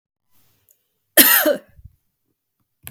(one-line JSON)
{"cough_length": "2.9 s", "cough_amplitude": 32768, "cough_signal_mean_std_ratio": 0.28, "survey_phase": "beta (2021-08-13 to 2022-03-07)", "age": "65+", "gender": "Female", "wearing_mask": "No", "symptom_none": true, "smoker_status": "Never smoked", "respiratory_condition_asthma": false, "respiratory_condition_other": false, "recruitment_source": "REACT", "submission_delay": "1 day", "covid_test_result": "Negative", "covid_test_method": "RT-qPCR", "influenza_a_test_result": "Unknown/Void", "influenza_b_test_result": "Unknown/Void"}